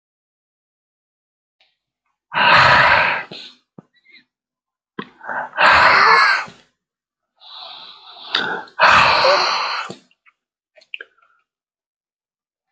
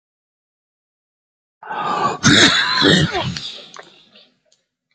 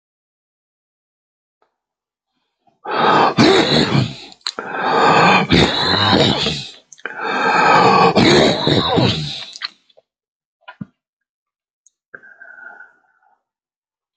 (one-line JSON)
{"exhalation_length": "12.7 s", "exhalation_amplitude": 30133, "exhalation_signal_mean_std_ratio": 0.41, "cough_length": "4.9 s", "cough_amplitude": 30928, "cough_signal_mean_std_ratio": 0.45, "three_cough_length": "14.2 s", "three_cough_amplitude": 32102, "three_cough_signal_mean_std_ratio": 0.52, "survey_phase": "beta (2021-08-13 to 2022-03-07)", "age": "65+", "gender": "Male", "wearing_mask": "No", "symptom_runny_or_blocked_nose": true, "smoker_status": "Never smoked", "respiratory_condition_asthma": false, "respiratory_condition_other": false, "recruitment_source": "REACT", "submission_delay": "1 day", "covid_test_result": "Negative", "covid_test_method": "RT-qPCR"}